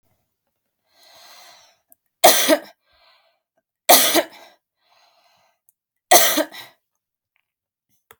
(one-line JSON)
{"three_cough_length": "8.2 s", "three_cough_amplitude": 32768, "three_cough_signal_mean_std_ratio": 0.27, "survey_phase": "alpha (2021-03-01 to 2021-08-12)", "age": "18-44", "gender": "Female", "wearing_mask": "No", "symptom_fatigue": true, "symptom_onset": "13 days", "smoker_status": "Ex-smoker", "respiratory_condition_asthma": false, "respiratory_condition_other": false, "recruitment_source": "REACT", "submission_delay": "2 days", "covid_test_result": "Negative", "covid_test_method": "RT-qPCR"}